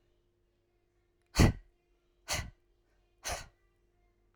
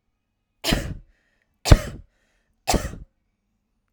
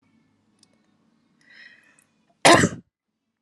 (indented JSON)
{
  "exhalation_length": "4.4 s",
  "exhalation_amplitude": 9512,
  "exhalation_signal_mean_std_ratio": 0.22,
  "three_cough_length": "3.9 s",
  "three_cough_amplitude": 32768,
  "three_cough_signal_mean_std_ratio": 0.24,
  "cough_length": "3.4 s",
  "cough_amplitude": 31216,
  "cough_signal_mean_std_ratio": 0.21,
  "survey_phase": "alpha (2021-03-01 to 2021-08-12)",
  "age": "18-44",
  "gender": "Female",
  "wearing_mask": "No",
  "symptom_none": true,
  "smoker_status": "Never smoked",
  "respiratory_condition_asthma": false,
  "respiratory_condition_other": false,
  "recruitment_source": "REACT",
  "submission_delay": "2 days",
  "covid_test_result": "Negative",
  "covid_test_method": "RT-qPCR"
}